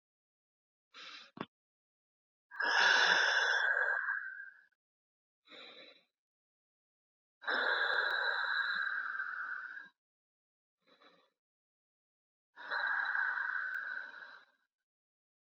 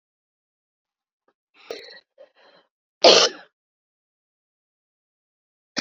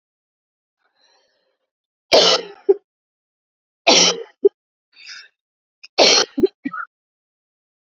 exhalation_length: 15.5 s
exhalation_amplitude: 5539
exhalation_signal_mean_std_ratio: 0.49
cough_length: 5.8 s
cough_amplitude: 31838
cough_signal_mean_std_ratio: 0.18
three_cough_length: 7.9 s
three_cough_amplitude: 31969
three_cough_signal_mean_std_ratio: 0.3
survey_phase: beta (2021-08-13 to 2022-03-07)
age: 45-64
gender: Female
wearing_mask: 'No'
symptom_cough_any: true
symptom_runny_or_blocked_nose: true
symptom_fatigue: true
symptom_headache: true
symptom_onset: 4 days
smoker_status: Never smoked
respiratory_condition_asthma: false
respiratory_condition_other: false
recruitment_source: Test and Trace
submission_delay: 2 days
covid_test_result: Negative
covid_test_method: ePCR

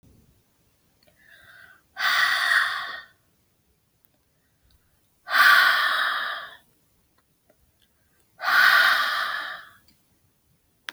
exhalation_length: 10.9 s
exhalation_amplitude: 21945
exhalation_signal_mean_std_ratio: 0.42
survey_phase: beta (2021-08-13 to 2022-03-07)
age: 45-64
gender: Female
wearing_mask: 'No'
symptom_cough_any: true
symptom_runny_or_blocked_nose: true
symptom_sore_throat: true
symptom_other: true
symptom_onset: 4 days
smoker_status: Never smoked
respiratory_condition_asthma: false
respiratory_condition_other: false
recruitment_source: Test and Trace
submission_delay: 1 day
covid_test_result: Positive
covid_test_method: RT-qPCR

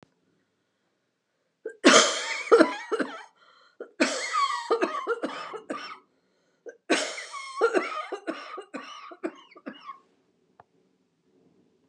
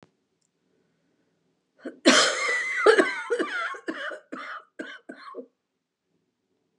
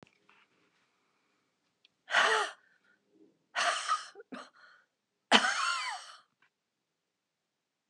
three_cough_length: 11.9 s
three_cough_amplitude: 27940
three_cough_signal_mean_std_ratio: 0.38
cough_length: 6.8 s
cough_amplitude: 22035
cough_signal_mean_std_ratio: 0.39
exhalation_length: 7.9 s
exhalation_amplitude: 16245
exhalation_signal_mean_std_ratio: 0.33
survey_phase: beta (2021-08-13 to 2022-03-07)
age: 65+
gender: Female
wearing_mask: 'No'
symptom_headache: true
symptom_change_to_sense_of_smell_or_taste: true
symptom_loss_of_taste: true
symptom_onset: 12 days
smoker_status: Ex-smoker
respiratory_condition_asthma: false
respiratory_condition_other: false
recruitment_source: REACT
submission_delay: 12 days
covid_test_result: Positive
covid_test_method: RT-qPCR
covid_ct_value: 35.6
covid_ct_gene: E gene
influenza_a_test_result: Negative
influenza_b_test_result: Negative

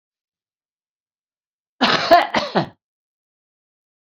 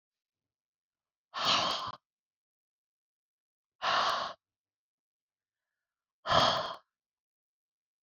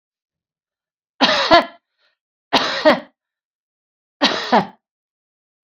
cough_length: 4.1 s
cough_amplitude: 30225
cough_signal_mean_std_ratio: 0.29
exhalation_length: 8.0 s
exhalation_amplitude: 9524
exhalation_signal_mean_std_ratio: 0.33
three_cough_length: 5.6 s
three_cough_amplitude: 29347
three_cough_signal_mean_std_ratio: 0.34
survey_phase: beta (2021-08-13 to 2022-03-07)
age: 45-64
gender: Female
wearing_mask: 'No'
symptom_none: true
smoker_status: Current smoker (e-cigarettes or vapes only)
respiratory_condition_asthma: false
respiratory_condition_other: false
recruitment_source: REACT
submission_delay: 0 days
covid_test_result: Negative
covid_test_method: RT-qPCR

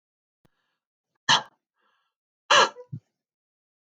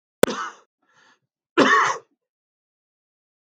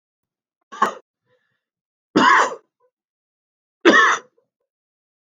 exhalation_length: 3.8 s
exhalation_amplitude: 17651
exhalation_signal_mean_std_ratio: 0.22
cough_length: 3.4 s
cough_amplitude: 32766
cough_signal_mean_std_ratio: 0.29
three_cough_length: 5.4 s
three_cough_amplitude: 32766
three_cough_signal_mean_std_ratio: 0.3
survey_phase: beta (2021-08-13 to 2022-03-07)
age: 45-64
gender: Male
wearing_mask: 'No'
symptom_none: true
smoker_status: Never smoked
respiratory_condition_asthma: false
respiratory_condition_other: false
recruitment_source: REACT
submission_delay: 3 days
covid_test_result: Negative
covid_test_method: RT-qPCR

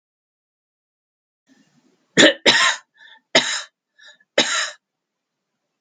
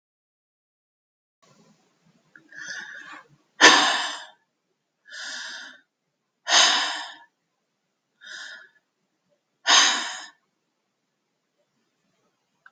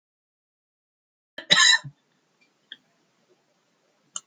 three_cough_length: 5.8 s
three_cough_amplitude: 32767
three_cough_signal_mean_std_ratio: 0.3
exhalation_length: 12.7 s
exhalation_amplitude: 32767
exhalation_signal_mean_std_ratio: 0.27
cough_length: 4.3 s
cough_amplitude: 28189
cough_signal_mean_std_ratio: 0.21
survey_phase: beta (2021-08-13 to 2022-03-07)
age: 65+
gender: Female
wearing_mask: 'No'
symptom_runny_or_blocked_nose: true
smoker_status: Ex-smoker
respiratory_condition_asthma: false
respiratory_condition_other: false
recruitment_source: REACT
submission_delay: 1 day
covid_test_result: Negative
covid_test_method: RT-qPCR
influenza_a_test_result: Negative
influenza_b_test_result: Negative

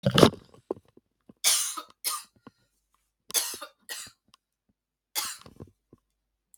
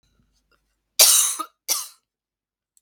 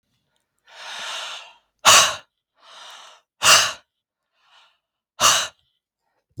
three_cough_length: 6.6 s
three_cough_amplitude: 32766
three_cough_signal_mean_std_ratio: 0.27
cough_length: 2.8 s
cough_amplitude: 32768
cough_signal_mean_std_ratio: 0.31
exhalation_length: 6.4 s
exhalation_amplitude: 32768
exhalation_signal_mean_std_ratio: 0.3
survey_phase: beta (2021-08-13 to 2022-03-07)
age: 45-64
gender: Female
wearing_mask: 'No'
symptom_cough_any: true
symptom_runny_or_blocked_nose: true
symptom_sore_throat: true
symptom_fatigue: true
symptom_headache: true
symptom_change_to_sense_of_smell_or_taste: true
smoker_status: Never smoked
respiratory_condition_asthma: false
respiratory_condition_other: false
recruitment_source: Test and Trace
submission_delay: 1 day
covid_test_result: Positive
covid_test_method: RT-qPCR
covid_ct_value: 22.1
covid_ct_gene: ORF1ab gene
covid_ct_mean: 22.8
covid_viral_load: 32000 copies/ml
covid_viral_load_category: Low viral load (10K-1M copies/ml)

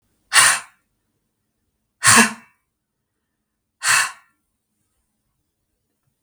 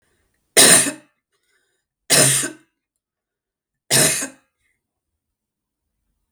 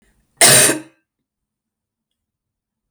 exhalation_length: 6.2 s
exhalation_amplitude: 32768
exhalation_signal_mean_std_ratio: 0.27
three_cough_length: 6.3 s
three_cough_amplitude: 32768
three_cough_signal_mean_std_ratio: 0.31
cough_length: 2.9 s
cough_amplitude: 32768
cough_signal_mean_std_ratio: 0.29
survey_phase: beta (2021-08-13 to 2022-03-07)
age: 45-64
gender: Female
wearing_mask: 'No'
symptom_runny_or_blocked_nose: true
symptom_fatigue: true
symptom_headache: true
symptom_onset: 5 days
smoker_status: Never smoked
respiratory_condition_asthma: false
respiratory_condition_other: false
recruitment_source: Test and Trace
submission_delay: 2 days
covid_test_result: Positive
covid_test_method: RT-qPCR
covid_ct_value: 19.2
covid_ct_gene: ORF1ab gene
covid_ct_mean: 19.5
covid_viral_load: 410000 copies/ml
covid_viral_load_category: Low viral load (10K-1M copies/ml)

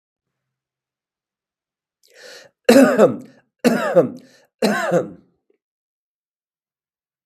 three_cough_length: 7.3 s
three_cough_amplitude: 32768
three_cough_signal_mean_std_ratio: 0.32
survey_phase: beta (2021-08-13 to 2022-03-07)
age: 65+
gender: Male
wearing_mask: 'No'
symptom_none: true
smoker_status: Ex-smoker
respiratory_condition_asthma: false
respiratory_condition_other: false
recruitment_source: REACT
submission_delay: 1 day
covid_test_result: Negative
covid_test_method: RT-qPCR
influenza_a_test_result: Negative
influenza_b_test_result: Negative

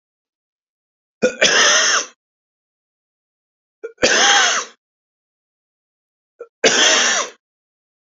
three_cough_length: 8.2 s
three_cough_amplitude: 32768
three_cough_signal_mean_std_ratio: 0.41
survey_phase: beta (2021-08-13 to 2022-03-07)
age: 65+
gender: Male
wearing_mask: 'No'
symptom_none: true
smoker_status: Ex-smoker
respiratory_condition_asthma: false
respiratory_condition_other: false
recruitment_source: REACT
submission_delay: 7 days
covid_test_result: Negative
covid_test_method: RT-qPCR
influenza_a_test_result: Negative
influenza_b_test_result: Negative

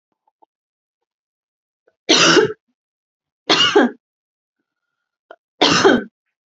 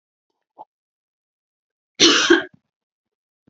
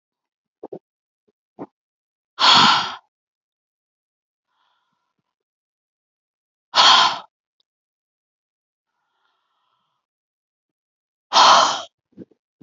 three_cough_length: 6.5 s
three_cough_amplitude: 30477
three_cough_signal_mean_std_ratio: 0.35
cough_length: 3.5 s
cough_amplitude: 32768
cough_signal_mean_std_ratio: 0.26
exhalation_length: 12.6 s
exhalation_amplitude: 32003
exhalation_signal_mean_std_ratio: 0.26
survey_phase: beta (2021-08-13 to 2022-03-07)
age: 18-44
gender: Female
wearing_mask: 'No'
symptom_fever_high_temperature: true
smoker_status: Never smoked
respiratory_condition_asthma: true
respiratory_condition_other: false
recruitment_source: Test and Trace
submission_delay: 0 days
covid_test_result: Positive
covid_test_method: LFT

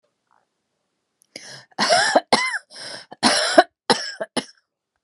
cough_length: 5.0 s
cough_amplitude: 32768
cough_signal_mean_std_ratio: 0.38
survey_phase: beta (2021-08-13 to 2022-03-07)
age: 45-64
gender: Female
wearing_mask: 'No'
symptom_sore_throat: true
smoker_status: Ex-smoker
respiratory_condition_asthma: true
respiratory_condition_other: false
recruitment_source: REACT
submission_delay: 2 days
covid_test_result: Negative
covid_test_method: RT-qPCR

